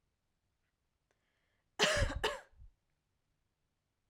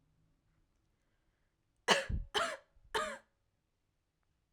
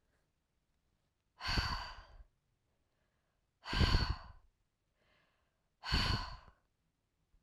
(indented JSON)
{
  "cough_length": "4.1 s",
  "cough_amplitude": 5746,
  "cough_signal_mean_std_ratio": 0.28,
  "three_cough_length": "4.5 s",
  "three_cough_amplitude": 8227,
  "three_cough_signal_mean_std_ratio": 0.3,
  "exhalation_length": "7.4 s",
  "exhalation_amplitude": 4632,
  "exhalation_signal_mean_std_ratio": 0.34,
  "survey_phase": "beta (2021-08-13 to 2022-03-07)",
  "age": "18-44",
  "gender": "Female",
  "wearing_mask": "No",
  "symptom_cough_any": true,
  "symptom_runny_or_blocked_nose": true,
  "symptom_shortness_of_breath": true,
  "symptom_sore_throat": true,
  "symptom_headache": true,
  "symptom_onset": "4 days",
  "smoker_status": "Never smoked",
  "respiratory_condition_asthma": true,
  "respiratory_condition_other": false,
  "recruitment_source": "Test and Trace",
  "submission_delay": "1 day",
  "covid_test_result": "Positive",
  "covid_test_method": "RT-qPCR"
}